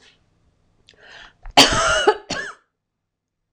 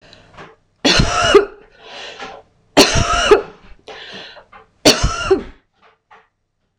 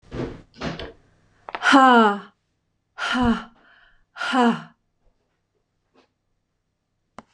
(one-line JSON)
{"cough_length": "3.5 s", "cough_amplitude": 26028, "cough_signal_mean_std_ratio": 0.33, "three_cough_length": "6.8 s", "three_cough_amplitude": 26028, "three_cough_signal_mean_std_ratio": 0.42, "exhalation_length": "7.3 s", "exhalation_amplitude": 25695, "exhalation_signal_mean_std_ratio": 0.35, "survey_phase": "beta (2021-08-13 to 2022-03-07)", "age": "45-64", "gender": "Female", "wearing_mask": "No", "symptom_none": true, "smoker_status": "Never smoked", "respiratory_condition_asthma": false, "respiratory_condition_other": false, "recruitment_source": "REACT", "submission_delay": "1 day", "covid_test_result": "Negative", "covid_test_method": "RT-qPCR", "influenza_a_test_result": "Negative", "influenza_b_test_result": "Negative"}